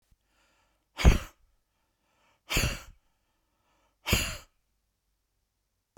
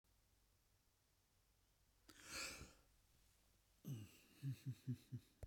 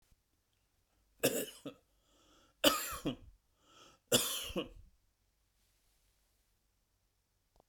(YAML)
exhalation_length: 6.0 s
exhalation_amplitude: 16319
exhalation_signal_mean_std_ratio: 0.23
cough_length: 5.5 s
cough_amplitude: 445
cough_signal_mean_std_ratio: 0.42
three_cough_length: 7.7 s
three_cough_amplitude: 7745
three_cough_signal_mean_std_ratio: 0.28
survey_phase: beta (2021-08-13 to 2022-03-07)
age: 65+
gender: Male
wearing_mask: 'No'
symptom_none: true
smoker_status: Never smoked
respiratory_condition_asthma: false
respiratory_condition_other: false
recruitment_source: REACT
submission_delay: 2 days
covid_test_result: Negative
covid_test_method: RT-qPCR